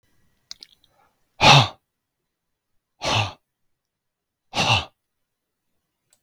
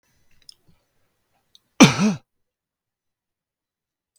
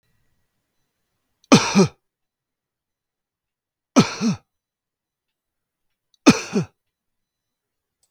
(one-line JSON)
{"exhalation_length": "6.2 s", "exhalation_amplitude": 32768, "exhalation_signal_mean_std_ratio": 0.25, "cough_length": "4.2 s", "cough_amplitude": 32768, "cough_signal_mean_std_ratio": 0.19, "three_cough_length": "8.1 s", "three_cough_amplitude": 32768, "three_cough_signal_mean_std_ratio": 0.23, "survey_phase": "beta (2021-08-13 to 2022-03-07)", "age": "45-64", "gender": "Male", "wearing_mask": "No", "symptom_none": true, "smoker_status": "Ex-smoker", "respiratory_condition_asthma": false, "respiratory_condition_other": false, "recruitment_source": "REACT", "submission_delay": "3 days", "covid_test_result": "Negative", "covid_test_method": "RT-qPCR"}